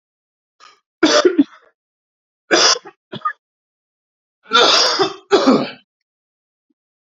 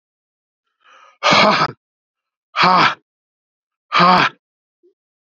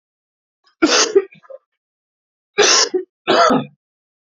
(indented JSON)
{
  "three_cough_length": "7.1 s",
  "three_cough_amplitude": 32768,
  "three_cough_signal_mean_std_ratio": 0.39,
  "exhalation_length": "5.4 s",
  "exhalation_amplitude": 30905,
  "exhalation_signal_mean_std_ratio": 0.38,
  "cough_length": "4.4 s",
  "cough_amplitude": 31360,
  "cough_signal_mean_std_ratio": 0.42,
  "survey_phase": "alpha (2021-03-01 to 2021-08-12)",
  "age": "45-64",
  "gender": "Male",
  "wearing_mask": "No",
  "symptom_cough_any": true,
  "symptom_shortness_of_breath": true,
  "symptom_fatigue": true,
  "symptom_headache": true,
  "symptom_change_to_sense_of_smell_or_taste": true,
  "symptom_loss_of_taste": true,
  "smoker_status": "Never smoked",
  "respiratory_condition_asthma": false,
  "respiratory_condition_other": false,
  "recruitment_source": "Test and Trace",
  "submission_delay": "2 days",
  "covid_test_result": "Positive",
  "covid_test_method": "RT-qPCR"
}